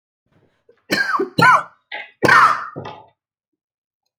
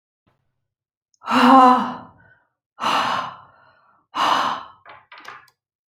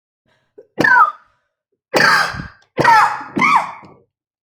{"cough_length": "4.2 s", "cough_amplitude": 32768, "cough_signal_mean_std_ratio": 0.39, "exhalation_length": "5.9 s", "exhalation_amplitude": 28172, "exhalation_signal_mean_std_ratio": 0.39, "three_cough_length": "4.4 s", "three_cough_amplitude": 30564, "three_cough_signal_mean_std_ratio": 0.49, "survey_phase": "alpha (2021-03-01 to 2021-08-12)", "age": "45-64", "gender": "Female", "wearing_mask": "No", "symptom_cough_any": true, "smoker_status": "Ex-smoker", "respiratory_condition_asthma": false, "respiratory_condition_other": false, "recruitment_source": "REACT", "submission_delay": "2 days", "covid_test_result": "Negative", "covid_test_method": "RT-qPCR"}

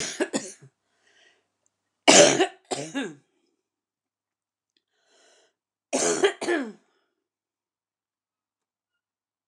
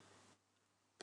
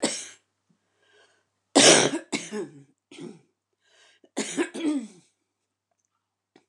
{"cough_length": "9.5 s", "cough_amplitude": 29203, "cough_signal_mean_std_ratio": 0.27, "exhalation_length": "1.0 s", "exhalation_amplitude": 578, "exhalation_signal_mean_std_ratio": 0.45, "three_cough_length": "6.7 s", "three_cough_amplitude": 25559, "three_cough_signal_mean_std_ratio": 0.3, "survey_phase": "alpha (2021-03-01 to 2021-08-12)", "age": "65+", "gender": "Female", "wearing_mask": "No", "symptom_cough_any": true, "symptom_shortness_of_breath": true, "symptom_fatigue": true, "symptom_onset": "12 days", "smoker_status": "Ex-smoker", "respiratory_condition_asthma": true, "respiratory_condition_other": false, "recruitment_source": "REACT", "submission_delay": "2 days", "covid_test_result": "Negative", "covid_test_method": "RT-qPCR"}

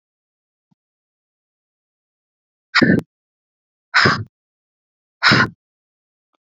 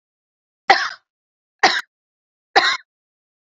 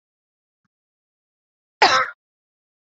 {"exhalation_length": "6.6 s", "exhalation_amplitude": 30936, "exhalation_signal_mean_std_ratio": 0.26, "three_cough_length": "3.4 s", "three_cough_amplitude": 32768, "three_cough_signal_mean_std_ratio": 0.29, "cough_length": "3.0 s", "cough_amplitude": 27975, "cough_signal_mean_std_ratio": 0.22, "survey_phase": "beta (2021-08-13 to 2022-03-07)", "age": "45-64", "gender": "Female", "wearing_mask": "No", "symptom_none": true, "smoker_status": "Ex-smoker", "respiratory_condition_asthma": false, "respiratory_condition_other": false, "recruitment_source": "REACT", "submission_delay": "1 day", "covid_test_result": "Negative", "covid_test_method": "RT-qPCR"}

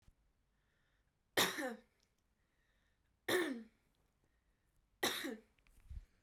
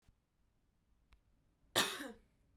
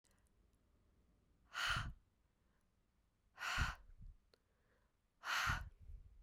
{"three_cough_length": "6.2 s", "three_cough_amplitude": 3289, "three_cough_signal_mean_std_ratio": 0.32, "cough_length": "2.6 s", "cough_amplitude": 3835, "cough_signal_mean_std_ratio": 0.26, "exhalation_length": "6.2 s", "exhalation_amplitude": 1746, "exhalation_signal_mean_std_ratio": 0.4, "survey_phase": "beta (2021-08-13 to 2022-03-07)", "age": "18-44", "gender": "Female", "wearing_mask": "No", "symptom_none": true, "smoker_status": "Never smoked", "respiratory_condition_asthma": false, "respiratory_condition_other": false, "recruitment_source": "REACT", "submission_delay": "2 days", "covid_test_result": "Negative", "covid_test_method": "RT-qPCR"}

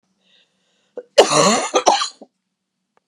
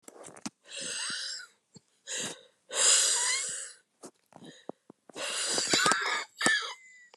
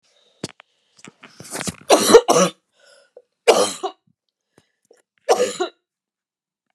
{"cough_length": "3.1 s", "cough_amplitude": 32768, "cough_signal_mean_std_ratio": 0.38, "exhalation_length": "7.2 s", "exhalation_amplitude": 22053, "exhalation_signal_mean_std_ratio": 0.54, "three_cough_length": "6.7 s", "three_cough_amplitude": 32768, "three_cough_signal_mean_std_ratio": 0.31, "survey_phase": "beta (2021-08-13 to 2022-03-07)", "age": "45-64", "gender": "Female", "wearing_mask": "No", "symptom_new_continuous_cough": true, "symptom_runny_or_blocked_nose": true, "symptom_shortness_of_breath": true, "symptom_sore_throat": true, "symptom_diarrhoea": true, "symptom_fatigue": true, "symptom_fever_high_temperature": true, "symptom_headache": true, "symptom_change_to_sense_of_smell_or_taste": true, "symptom_loss_of_taste": true, "symptom_onset": "3 days", "smoker_status": "Never smoked", "respiratory_condition_asthma": false, "respiratory_condition_other": false, "recruitment_source": "Test and Trace", "submission_delay": "2 days", "covid_test_result": "Positive", "covid_test_method": "RT-qPCR", "covid_ct_value": 14.6, "covid_ct_gene": "ORF1ab gene", "covid_ct_mean": 15.0, "covid_viral_load": "12000000 copies/ml", "covid_viral_load_category": "High viral load (>1M copies/ml)"}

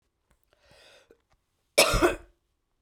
{"cough_length": "2.8 s", "cough_amplitude": 18884, "cough_signal_mean_std_ratio": 0.27, "survey_phase": "beta (2021-08-13 to 2022-03-07)", "age": "45-64", "gender": "Female", "wearing_mask": "No", "symptom_cough_any": true, "symptom_shortness_of_breath": true, "symptom_fatigue": true, "symptom_headache": true, "smoker_status": "Never smoked", "respiratory_condition_asthma": true, "respiratory_condition_other": false, "recruitment_source": "Test and Trace", "submission_delay": "2 days", "covid_test_result": "Positive", "covid_test_method": "RT-qPCR", "covid_ct_value": 20.2, "covid_ct_gene": "ORF1ab gene", "covid_ct_mean": 20.6, "covid_viral_load": "170000 copies/ml", "covid_viral_load_category": "Low viral load (10K-1M copies/ml)"}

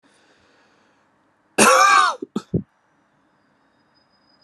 {"cough_length": "4.4 s", "cough_amplitude": 31372, "cough_signal_mean_std_ratio": 0.32, "survey_phase": "alpha (2021-03-01 to 2021-08-12)", "age": "18-44", "gender": "Male", "wearing_mask": "No", "symptom_cough_any": true, "symptom_fatigue": true, "symptom_fever_high_temperature": true, "symptom_headache": true, "symptom_onset": "2 days", "smoker_status": "Never smoked", "respiratory_condition_asthma": true, "respiratory_condition_other": false, "recruitment_source": "Test and Trace", "submission_delay": "1 day", "covid_test_result": "Positive", "covid_test_method": "RT-qPCR"}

